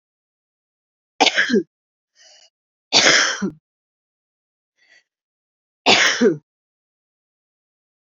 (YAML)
three_cough_length: 8.0 s
three_cough_amplitude: 32767
three_cough_signal_mean_std_ratio: 0.32
survey_phase: beta (2021-08-13 to 2022-03-07)
age: 18-44
gender: Female
wearing_mask: 'No'
symptom_new_continuous_cough: true
symptom_runny_or_blocked_nose: true
symptom_shortness_of_breath: true
symptom_sore_throat: true
symptom_fatigue: true
symptom_fever_high_temperature: true
symptom_headache: true
symptom_change_to_sense_of_smell_or_taste: true
symptom_onset: 5 days
smoker_status: Prefer not to say
respiratory_condition_asthma: true
respiratory_condition_other: false
recruitment_source: Test and Trace
submission_delay: 2 days
covid_test_result: Positive
covid_test_method: RT-qPCR
covid_ct_value: 14.7
covid_ct_gene: ORF1ab gene
covid_ct_mean: 15.0
covid_viral_load: 12000000 copies/ml
covid_viral_load_category: High viral load (>1M copies/ml)